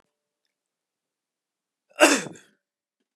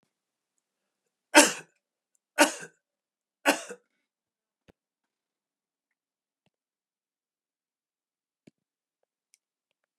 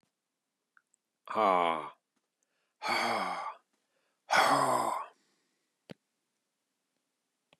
{"cough_length": "3.2 s", "cough_amplitude": 31085, "cough_signal_mean_std_ratio": 0.19, "three_cough_length": "10.0 s", "three_cough_amplitude": 30997, "three_cough_signal_mean_std_ratio": 0.14, "exhalation_length": "7.6 s", "exhalation_amplitude": 8802, "exhalation_signal_mean_std_ratio": 0.38, "survey_phase": "beta (2021-08-13 to 2022-03-07)", "age": "45-64", "gender": "Male", "wearing_mask": "No", "symptom_none": true, "smoker_status": "Never smoked", "respiratory_condition_asthma": false, "respiratory_condition_other": false, "recruitment_source": "REACT", "submission_delay": "1 day", "covid_test_result": "Negative", "covid_test_method": "RT-qPCR", "influenza_a_test_result": "Negative", "influenza_b_test_result": "Negative"}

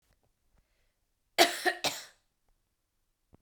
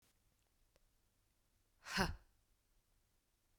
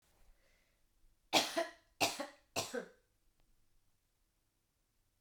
{"cough_length": "3.4 s", "cough_amplitude": 18073, "cough_signal_mean_std_ratio": 0.24, "exhalation_length": "3.6 s", "exhalation_amplitude": 2761, "exhalation_signal_mean_std_ratio": 0.23, "three_cough_length": "5.2 s", "three_cough_amplitude": 5472, "three_cough_signal_mean_std_ratio": 0.28, "survey_phase": "beta (2021-08-13 to 2022-03-07)", "age": "18-44", "gender": "Female", "wearing_mask": "No", "symptom_runny_or_blocked_nose": true, "symptom_sore_throat": true, "symptom_fatigue": true, "symptom_fever_high_temperature": true, "symptom_headache": true, "symptom_onset": "3 days", "smoker_status": "Never smoked", "respiratory_condition_asthma": false, "respiratory_condition_other": false, "recruitment_source": "Test and Trace", "submission_delay": "1 day", "covid_test_result": "Positive", "covid_test_method": "RT-qPCR", "covid_ct_value": 18.5, "covid_ct_gene": "ORF1ab gene", "covid_ct_mean": 18.7, "covid_viral_load": "730000 copies/ml", "covid_viral_load_category": "Low viral load (10K-1M copies/ml)"}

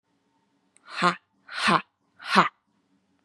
{"exhalation_length": "3.2 s", "exhalation_amplitude": 28186, "exhalation_signal_mean_std_ratio": 0.31, "survey_phase": "beta (2021-08-13 to 2022-03-07)", "age": "18-44", "gender": "Female", "wearing_mask": "No", "symptom_cough_any": true, "symptom_runny_or_blocked_nose": true, "symptom_sore_throat": true, "symptom_fatigue": true, "symptom_headache": true, "smoker_status": "Never smoked", "respiratory_condition_asthma": false, "respiratory_condition_other": false, "recruitment_source": "Test and Trace", "submission_delay": "2 days", "covid_test_result": "Positive", "covid_test_method": "LFT"}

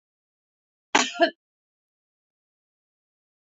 {"cough_length": "3.4 s", "cough_amplitude": 23051, "cough_signal_mean_std_ratio": 0.19, "survey_phase": "beta (2021-08-13 to 2022-03-07)", "age": "45-64", "gender": "Female", "wearing_mask": "No", "symptom_none": true, "smoker_status": "Ex-smoker", "respiratory_condition_asthma": false, "respiratory_condition_other": false, "recruitment_source": "REACT", "submission_delay": "0 days", "covid_test_result": "Negative", "covid_test_method": "RT-qPCR", "influenza_a_test_result": "Negative", "influenza_b_test_result": "Negative"}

